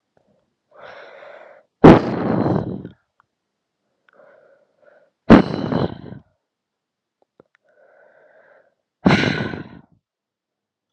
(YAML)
exhalation_length: 10.9 s
exhalation_amplitude: 32768
exhalation_signal_mean_std_ratio: 0.26
survey_phase: beta (2021-08-13 to 2022-03-07)
age: 18-44
gender: Female
wearing_mask: 'No'
symptom_cough_any: true
symptom_new_continuous_cough: true
symptom_runny_or_blocked_nose: true
symptom_shortness_of_breath: true
symptom_fatigue: true
symptom_headache: true
symptom_other: true
symptom_onset: 5 days
smoker_status: Ex-smoker
respiratory_condition_asthma: false
respiratory_condition_other: false
recruitment_source: Test and Trace
submission_delay: 1 day
covid_test_result: Positive
covid_test_method: RT-qPCR
covid_ct_value: 20.3
covid_ct_gene: ORF1ab gene
covid_ct_mean: 20.6
covid_viral_load: 170000 copies/ml
covid_viral_load_category: Low viral load (10K-1M copies/ml)